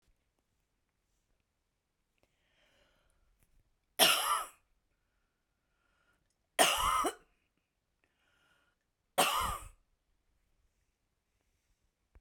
{
  "three_cough_length": "12.2 s",
  "three_cough_amplitude": 10153,
  "three_cough_signal_mean_std_ratio": 0.26,
  "survey_phase": "beta (2021-08-13 to 2022-03-07)",
  "age": "45-64",
  "gender": "Female",
  "wearing_mask": "No",
  "symptom_none": true,
  "smoker_status": "Never smoked",
  "respiratory_condition_asthma": false,
  "respiratory_condition_other": false,
  "recruitment_source": "REACT",
  "submission_delay": "1 day",
  "covid_test_result": "Negative",
  "covid_test_method": "RT-qPCR"
}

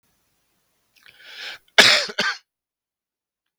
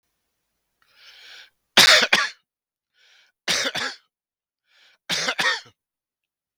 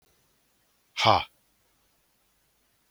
{
  "cough_length": "3.6 s",
  "cough_amplitude": 32768,
  "cough_signal_mean_std_ratio": 0.26,
  "three_cough_length": "6.6 s",
  "three_cough_amplitude": 32768,
  "three_cough_signal_mean_std_ratio": 0.31,
  "exhalation_length": "2.9 s",
  "exhalation_amplitude": 18825,
  "exhalation_signal_mean_std_ratio": 0.21,
  "survey_phase": "beta (2021-08-13 to 2022-03-07)",
  "age": "45-64",
  "gender": "Male",
  "wearing_mask": "No",
  "symptom_cough_any": true,
  "symptom_runny_or_blocked_nose": true,
  "symptom_sore_throat": true,
  "smoker_status": "Never smoked",
  "respiratory_condition_asthma": true,
  "respiratory_condition_other": false,
  "recruitment_source": "Test and Trace",
  "submission_delay": "2 days",
  "covid_test_result": "Positive",
  "covid_test_method": "RT-qPCR",
  "covid_ct_value": 17.4,
  "covid_ct_gene": "N gene"
}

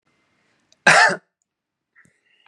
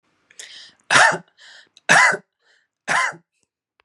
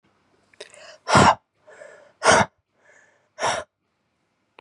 {
  "cough_length": "2.5 s",
  "cough_amplitude": 32615,
  "cough_signal_mean_std_ratio": 0.27,
  "three_cough_length": "3.8 s",
  "three_cough_amplitude": 31849,
  "three_cough_signal_mean_std_ratio": 0.36,
  "exhalation_length": "4.6 s",
  "exhalation_amplitude": 28322,
  "exhalation_signal_mean_std_ratio": 0.3,
  "survey_phase": "beta (2021-08-13 to 2022-03-07)",
  "age": "18-44",
  "gender": "Male",
  "wearing_mask": "No",
  "symptom_none": true,
  "smoker_status": "Current smoker (1 to 10 cigarettes per day)",
  "respiratory_condition_asthma": false,
  "respiratory_condition_other": false,
  "recruitment_source": "REACT",
  "submission_delay": "2 days",
  "covid_test_result": "Negative",
  "covid_test_method": "RT-qPCR",
  "influenza_a_test_result": "Negative",
  "influenza_b_test_result": "Negative"
}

